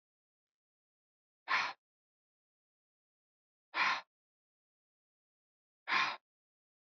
{
  "exhalation_length": "6.8 s",
  "exhalation_amplitude": 3469,
  "exhalation_signal_mean_std_ratio": 0.26,
  "survey_phase": "beta (2021-08-13 to 2022-03-07)",
  "age": "18-44",
  "gender": "Male",
  "wearing_mask": "No",
  "symptom_none": true,
  "smoker_status": "Never smoked",
  "respiratory_condition_asthma": false,
  "respiratory_condition_other": false,
  "recruitment_source": "REACT",
  "submission_delay": "1 day",
  "covid_test_result": "Negative",
  "covid_test_method": "RT-qPCR"
}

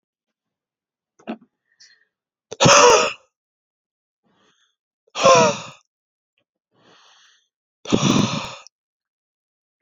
{
  "exhalation_length": "9.8 s",
  "exhalation_amplitude": 31487,
  "exhalation_signal_mean_std_ratio": 0.29,
  "survey_phase": "beta (2021-08-13 to 2022-03-07)",
  "age": "18-44",
  "gender": "Male",
  "wearing_mask": "No",
  "symptom_cough_any": true,
  "symptom_runny_or_blocked_nose": true,
  "symptom_shortness_of_breath": true,
  "symptom_sore_throat": true,
  "symptom_fatigue": true,
  "symptom_fever_high_temperature": true,
  "symptom_onset": "2 days",
  "smoker_status": "Ex-smoker",
  "respiratory_condition_asthma": true,
  "respiratory_condition_other": false,
  "recruitment_source": "Test and Trace",
  "submission_delay": "1 day",
  "covid_test_result": "Positive",
  "covid_test_method": "RT-qPCR",
  "covid_ct_value": 23.6,
  "covid_ct_gene": "ORF1ab gene"
}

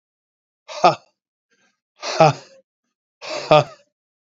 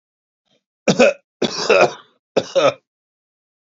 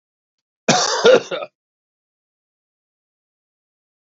{
  "exhalation_length": "4.3 s",
  "exhalation_amplitude": 32767,
  "exhalation_signal_mean_std_ratio": 0.28,
  "three_cough_length": "3.7 s",
  "three_cough_amplitude": 28553,
  "three_cough_signal_mean_std_ratio": 0.37,
  "cough_length": "4.0 s",
  "cough_amplitude": 30249,
  "cough_signal_mean_std_ratio": 0.28,
  "survey_phase": "beta (2021-08-13 to 2022-03-07)",
  "age": "65+",
  "gender": "Male",
  "wearing_mask": "No",
  "symptom_cough_any": true,
  "symptom_runny_or_blocked_nose": true,
  "smoker_status": "Never smoked",
  "respiratory_condition_asthma": false,
  "respiratory_condition_other": false,
  "recruitment_source": "Test and Trace",
  "submission_delay": "1 day",
  "covid_test_result": "Positive",
  "covid_test_method": "RT-qPCR",
  "covid_ct_value": 22.4,
  "covid_ct_gene": "ORF1ab gene",
  "covid_ct_mean": 23.4,
  "covid_viral_load": "22000 copies/ml",
  "covid_viral_load_category": "Low viral load (10K-1M copies/ml)"
}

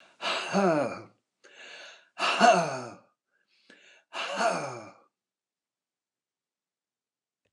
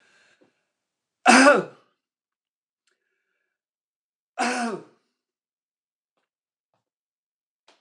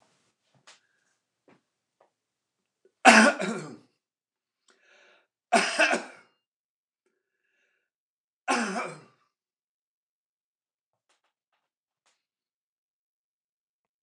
{
  "exhalation_length": "7.5 s",
  "exhalation_amplitude": 14699,
  "exhalation_signal_mean_std_ratio": 0.38,
  "cough_length": "7.8 s",
  "cough_amplitude": 29097,
  "cough_signal_mean_std_ratio": 0.21,
  "three_cough_length": "14.0 s",
  "three_cough_amplitude": 29080,
  "three_cough_signal_mean_std_ratio": 0.2,
  "survey_phase": "beta (2021-08-13 to 2022-03-07)",
  "age": "65+",
  "gender": "Male",
  "wearing_mask": "No",
  "symptom_none": true,
  "smoker_status": "Ex-smoker",
  "respiratory_condition_asthma": false,
  "respiratory_condition_other": false,
  "recruitment_source": "REACT",
  "submission_delay": "2 days",
  "covid_test_result": "Negative",
  "covid_test_method": "RT-qPCR",
  "influenza_a_test_result": "Negative",
  "influenza_b_test_result": "Negative"
}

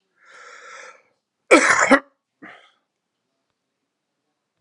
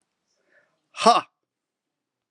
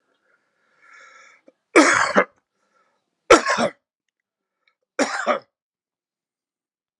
{
  "cough_length": "4.6 s",
  "cough_amplitude": 32768,
  "cough_signal_mean_std_ratio": 0.25,
  "exhalation_length": "2.3 s",
  "exhalation_amplitude": 29598,
  "exhalation_signal_mean_std_ratio": 0.21,
  "three_cough_length": "7.0 s",
  "three_cough_amplitude": 32768,
  "three_cough_signal_mean_std_ratio": 0.28,
  "survey_phase": "alpha (2021-03-01 to 2021-08-12)",
  "age": "45-64",
  "gender": "Male",
  "wearing_mask": "No",
  "symptom_cough_any": true,
  "symptom_new_continuous_cough": true,
  "symptom_fatigue": true,
  "symptom_headache": true,
  "symptom_onset": "2 days",
  "smoker_status": "Never smoked",
  "respiratory_condition_asthma": false,
  "respiratory_condition_other": false,
  "recruitment_source": "Test and Trace",
  "submission_delay": "2 days",
  "covid_test_result": "Positive",
  "covid_test_method": "RT-qPCR"
}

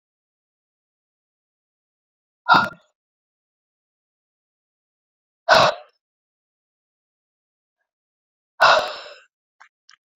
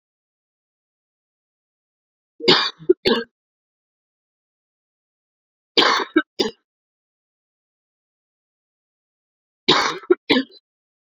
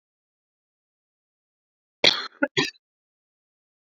{
  "exhalation_length": "10.2 s",
  "exhalation_amplitude": 28930,
  "exhalation_signal_mean_std_ratio": 0.21,
  "three_cough_length": "11.2 s",
  "three_cough_amplitude": 32768,
  "three_cough_signal_mean_std_ratio": 0.25,
  "cough_length": "3.9 s",
  "cough_amplitude": 27123,
  "cough_signal_mean_std_ratio": 0.19,
  "survey_phase": "beta (2021-08-13 to 2022-03-07)",
  "age": "45-64",
  "gender": "Female",
  "wearing_mask": "No",
  "symptom_cough_any": true,
  "symptom_runny_or_blocked_nose": true,
  "symptom_sore_throat": true,
  "symptom_fatigue": true,
  "symptom_headache": true,
  "symptom_onset": "3 days",
  "smoker_status": "Never smoked",
  "respiratory_condition_asthma": false,
  "respiratory_condition_other": false,
  "recruitment_source": "Test and Trace",
  "submission_delay": "2 days",
  "covid_test_result": "Positive",
  "covid_test_method": "RT-qPCR",
  "covid_ct_value": 18.3,
  "covid_ct_gene": "ORF1ab gene",
  "covid_ct_mean": 19.4,
  "covid_viral_load": "440000 copies/ml",
  "covid_viral_load_category": "Low viral load (10K-1M copies/ml)"
}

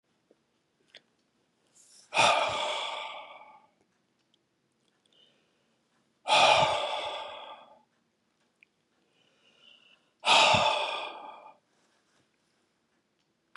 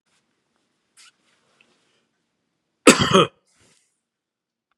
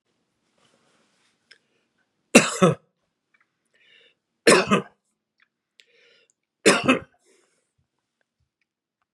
{
  "exhalation_length": "13.6 s",
  "exhalation_amplitude": 13220,
  "exhalation_signal_mean_std_ratio": 0.34,
  "cough_length": "4.8 s",
  "cough_amplitude": 32768,
  "cough_signal_mean_std_ratio": 0.19,
  "three_cough_length": "9.1 s",
  "three_cough_amplitude": 32767,
  "three_cough_signal_mean_std_ratio": 0.23,
  "survey_phase": "beta (2021-08-13 to 2022-03-07)",
  "age": "65+",
  "gender": "Male",
  "wearing_mask": "No",
  "symptom_none": true,
  "smoker_status": "Never smoked",
  "respiratory_condition_asthma": false,
  "respiratory_condition_other": false,
  "recruitment_source": "REACT",
  "submission_delay": "1 day",
  "covid_test_result": "Negative",
  "covid_test_method": "RT-qPCR",
  "influenza_a_test_result": "Negative",
  "influenza_b_test_result": "Negative"
}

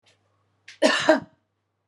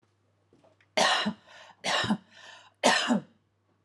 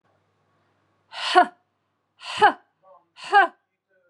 {
  "cough_length": "1.9 s",
  "cough_amplitude": 24695,
  "cough_signal_mean_std_ratio": 0.33,
  "three_cough_length": "3.8 s",
  "three_cough_amplitude": 13234,
  "three_cough_signal_mean_std_ratio": 0.44,
  "exhalation_length": "4.1 s",
  "exhalation_amplitude": 27072,
  "exhalation_signal_mean_std_ratio": 0.28,
  "survey_phase": "beta (2021-08-13 to 2022-03-07)",
  "age": "45-64",
  "gender": "Female",
  "wearing_mask": "No",
  "symptom_none": true,
  "smoker_status": "Ex-smoker",
  "respiratory_condition_asthma": false,
  "respiratory_condition_other": false,
  "recruitment_source": "REACT",
  "submission_delay": "1 day",
  "covid_test_result": "Negative",
  "covid_test_method": "RT-qPCR",
  "influenza_a_test_result": "Negative",
  "influenza_b_test_result": "Negative"
}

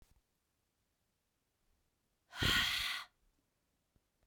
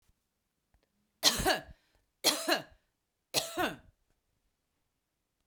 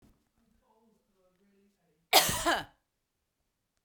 {
  "exhalation_length": "4.3 s",
  "exhalation_amplitude": 3098,
  "exhalation_signal_mean_std_ratio": 0.31,
  "three_cough_length": "5.5 s",
  "three_cough_amplitude": 11201,
  "three_cough_signal_mean_std_ratio": 0.31,
  "cough_length": "3.8 s",
  "cough_amplitude": 13978,
  "cough_signal_mean_std_ratio": 0.25,
  "survey_phase": "beta (2021-08-13 to 2022-03-07)",
  "age": "45-64",
  "gender": "Female",
  "wearing_mask": "No",
  "symptom_shortness_of_breath": true,
  "symptom_fatigue": true,
  "symptom_headache": true,
  "smoker_status": "Ex-smoker",
  "respiratory_condition_asthma": false,
  "respiratory_condition_other": false,
  "recruitment_source": "REACT",
  "submission_delay": "3 days",
  "covid_test_result": "Negative",
  "covid_test_method": "RT-qPCR",
  "covid_ct_value": 44.0,
  "covid_ct_gene": "N gene"
}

